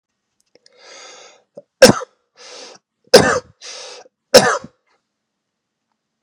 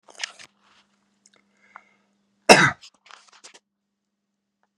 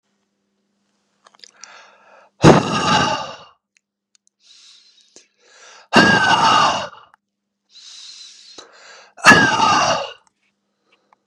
{
  "three_cough_length": "6.2 s",
  "three_cough_amplitude": 32768,
  "three_cough_signal_mean_std_ratio": 0.24,
  "cough_length": "4.8 s",
  "cough_amplitude": 32768,
  "cough_signal_mean_std_ratio": 0.17,
  "exhalation_length": "11.3 s",
  "exhalation_amplitude": 32768,
  "exhalation_signal_mean_std_ratio": 0.37,
  "survey_phase": "beta (2021-08-13 to 2022-03-07)",
  "age": "18-44",
  "gender": "Male",
  "wearing_mask": "No",
  "symptom_none": true,
  "smoker_status": "Ex-smoker",
  "respiratory_condition_asthma": false,
  "respiratory_condition_other": false,
  "recruitment_source": "REACT",
  "submission_delay": "1 day",
  "covid_test_result": "Negative",
  "covid_test_method": "RT-qPCR",
  "influenza_a_test_result": "Unknown/Void",
  "influenza_b_test_result": "Unknown/Void"
}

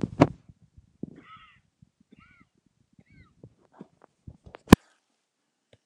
{
  "three_cough_length": "5.9 s",
  "three_cough_amplitude": 29204,
  "three_cough_signal_mean_std_ratio": 0.1,
  "survey_phase": "alpha (2021-03-01 to 2021-08-12)",
  "age": "65+",
  "gender": "Male",
  "wearing_mask": "No",
  "symptom_shortness_of_breath": true,
  "smoker_status": "Never smoked",
  "respiratory_condition_asthma": true,
  "respiratory_condition_other": true,
  "recruitment_source": "REACT",
  "submission_delay": "1 day",
  "covid_test_result": "Negative",
  "covid_test_method": "RT-qPCR"
}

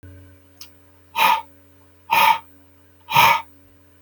{
  "exhalation_length": "4.0 s",
  "exhalation_amplitude": 29058,
  "exhalation_signal_mean_std_ratio": 0.39,
  "survey_phase": "beta (2021-08-13 to 2022-03-07)",
  "age": "45-64",
  "gender": "Male",
  "wearing_mask": "No",
  "symptom_none": true,
  "smoker_status": "Never smoked",
  "respiratory_condition_asthma": false,
  "respiratory_condition_other": false,
  "recruitment_source": "REACT",
  "submission_delay": "1 day",
  "covid_test_result": "Negative",
  "covid_test_method": "RT-qPCR"
}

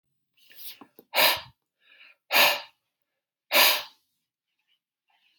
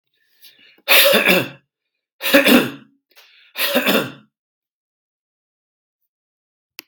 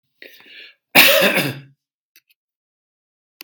{
  "exhalation_length": "5.4 s",
  "exhalation_amplitude": 20300,
  "exhalation_signal_mean_std_ratio": 0.31,
  "three_cough_length": "6.9 s",
  "three_cough_amplitude": 32768,
  "three_cough_signal_mean_std_ratio": 0.36,
  "cough_length": "3.4 s",
  "cough_amplitude": 32768,
  "cough_signal_mean_std_ratio": 0.32,
  "survey_phase": "beta (2021-08-13 to 2022-03-07)",
  "age": "45-64",
  "gender": "Male",
  "wearing_mask": "No",
  "symptom_none": true,
  "smoker_status": "Ex-smoker",
  "respiratory_condition_asthma": true,
  "respiratory_condition_other": false,
  "recruitment_source": "REACT",
  "submission_delay": "12 days",
  "covid_test_result": "Negative",
  "covid_test_method": "RT-qPCR"
}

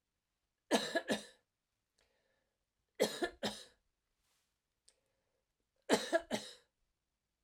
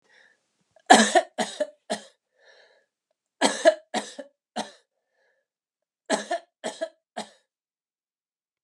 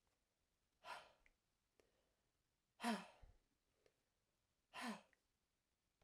{
  "three_cough_length": "7.4 s",
  "three_cough_amplitude": 5084,
  "three_cough_signal_mean_std_ratio": 0.28,
  "cough_length": "8.6 s",
  "cough_amplitude": 32716,
  "cough_signal_mean_std_ratio": 0.26,
  "exhalation_length": "6.0 s",
  "exhalation_amplitude": 944,
  "exhalation_signal_mean_std_ratio": 0.26,
  "survey_phase": "alpha (2021-03-01 to 2021-08-12)",
  "age": "65+",
  "gender": "Female",
  "wearing_mask": "No",
  "symptom_none": true,
  "smoker_status": "Never smoked",
  "respiratory_condition_asthma": false,
  "respiratory_condition_other": false,
  "recruitment_source": "REACT",
  "submission_delay": "2 days",
  "covid_test_result": "Negative",
  "covid_test_method": "RT-qPCR"
}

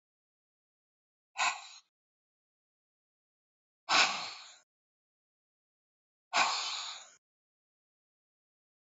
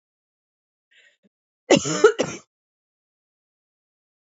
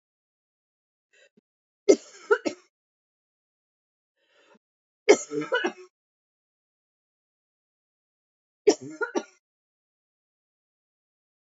{
  "exhalation_length": "9.0 s",
  "exhalation_amplitude": 8672,
  "exhalation_signal_mean_std_ratio": 0.26,
  "cough_length": "4.3 s",
  "cough_amplitude": 26149,
  "cough_signal_mean_std_ratio": 0.22,
  "three_cough_length": "11.5 s",
  "three_cough_amplitude": 24317,
  "three_cough_signal_mean_std_ratio": 0.18,
  "survey_phase": "beta (2021-08-13 to 2022-03-07)",
  "age": "45-64",
  "gender": "Female",
  "wearing_mask": "No",
  "symptom_runny_or_blocked_nose": true,
  "symptom_shortness_of_breath": true,
  "symptom_fatigue": true,
  "symptom_headache": true,
  "symptom_change_to_sense_of_smell_or_taste": true,
  "symptom_onset": "3 days",
  "smoker_status": "Ex-smoker",
  "respiratory_condition_asthma": false,
  "respiratory_condition_other": false,
  "recruitment_source": "Test and Trace",
  "submission_delay": "2 days",
  "covid_test_result": "Positive",
  "covid_test_method": "RT-qPCR",
  "covid_ct_value": 19.3,
  "covid_ct_gene": "ORF1ab gene",
  "covid_ct_mean": 19.8,
  "covid_viral_load": "320000 copies/ml",
  "covid_viral_load_category": "Low viral load (10K-1M copies/ml)"
}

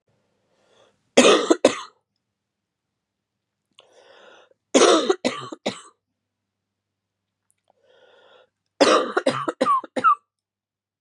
{
  "three_cough_length": "11.0 s",
  "three_cough_amplitude": 32220,
  "three_cough_signal_mean_std_ratio": 0.32,
  "survey_phase": "beta (2021-08-13 to 2022-03-07)",
  "age": "18-44",
  "gender": "Female",
  "wearing_mask": "No",
  "symptom_cough_any": true,
  "symptom_runny_or_blocked_nose": true,
  "symptom_shortness_of_breath": true,
  "symptom_sore_throat": true,
  "symptom_fatigue": true,
  "symptom_fever_high_temperature": true,
  "symptom_headache": true,
  "smoker_status": "Never smoked",
  "respiratory_condition_asthma": true,
  "respiratory_condition_other": false,
  "recruitment_source": "Test and Trace",
  "submission_delay": "2 days",
  "covid_test_result": "Positive",
  "covid_test_method": "LFT"
}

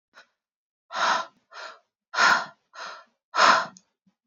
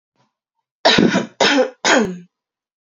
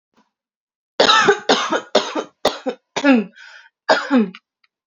{
  "exhalation_length": "4.3 s",
  "exhalation_amplitude": 22971,
  "exhalation_signal_mean_std_ratio": 0.37,
  "three_cough_length": "2.9 s",
  "three_cough_amplitude": 32364,
  "three_cough_signal_mean_std_ratio": 0.48,
  "cough_length": "4.9 s",
  "cough_amplitude": 31654,
  "cough_signal_mean_std_ratio": 0.46,
  "survey_phase": "alpha (2021-03-01 to 2021-08-12)",
  "age": "18-44",
  "gender": "Female",
  "wearing_mask": "No",
  "symptom_cough_any": true,
  "symptom_fatigue": true,
  "symptom_headache": true,
  "smoker_status": "Never smoked",
  "respiratory_condition_asthma": false,
  "respiratory_condition_other": false,
  "recruitment_source": "Test and Trace",
  "submission_delay": "2 days",
  "covid_test_result": "Positive",
  "covid_test_method": "RT-qPCR",
  "covid_ct_value": 17.7,
  "covid_ct_gene": "ORF1ab gene",
  "covid_ct_mean": 18.1,
  "covid_viral_load": "1200000 copies/ml",
  "covid_viral_load_category": "High viral load (>1M copies/ml)"
}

